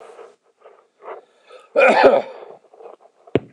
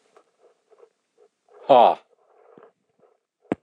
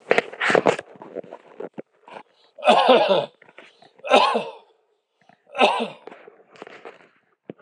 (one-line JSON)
{"cough_length": "3.5 s", "cough_amplitude": 26028, "cough_signal_mean_std_ratio": 0.34, "exhalation_length": "3.6 s", "exhalation_amplitude": 21607, "exhalation_signal_mean_std_ratio": 0.22, "three_cough_length": "7.6 s", "three_cough_amplitude": 26027, "three_cough_signal_mean_std_ratio": 0.38, "survey_phase": "beta (2021-08-13 to 2022-03-07)", "age": "65+", "gender": "Male", "wearing_mask": "No", "symptom_none": true, "smoker_status": "Ex-smoker", "respiratory_condition_asthma": true, "respiratory_condition_other": false, "recruitment_source": "Test and Trace", "submission_delay": "2 days", "covid_test_result": "Negative", "covid_test_method": "RT-qPCR"}